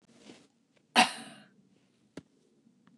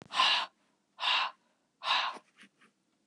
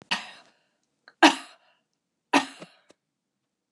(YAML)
cough_length: 3.0 s
cough_amplitude: 14680
cough_signal_mean_std_ratio: 0.2
exhalation_length: 3.1 s
exhalation_amplitude: 7742
exhalation_signal_mean_std_ratio: 0.45
three_cough_length: 3.7 s
three_cough_amplitude: 28188
three_cough_signal_mean_std_ratio: 0.21
survey_phase: beta (2021-08-13 to 2022-03-07)
age: 45-64
gender: Female
wearing_mask: 'No'
symptom_fatigue: true
smoker_status: Never smoked
respiratory_condition_asthma: false
respiratory_condition_other: false
recruitment_source: REACT
submission_delay: 1 day
covid_test_result: Negative
covid_test_method: RT-qPCR